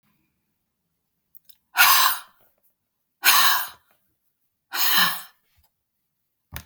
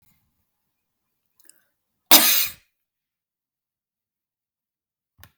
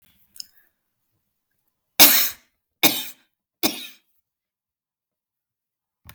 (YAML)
exhalation_length: 6.7 s
exhalation_amplitude: 26603
exhalation_signal_mean_std_ratio: 0.35
cough_length: 5.4 s
cough_amplitude: 32766
cough_signal_mean_std_ratio: 0.19
three_cough_length: 6.1 s
three_cough_amplitude: 32768
three_cough_signal_mean_std_ratio: 0.22
survey_phase: beta (2021-08-13 to 2022-03-07)
age: 45-64
gender: Female
wearing_mask: 'No'
symptom_cough_any: true
symptom_sore_throat: true
symptom_other: true
symptom_onset: 6 days
smoker_status: Never smoked
respiratory_condition_asthma: false
respiratory_condition_other: false
recruitment_source: Test and Trace
submission_delay: 1 day
covid_test_result: Negative
covid_test_method: RT-qPCR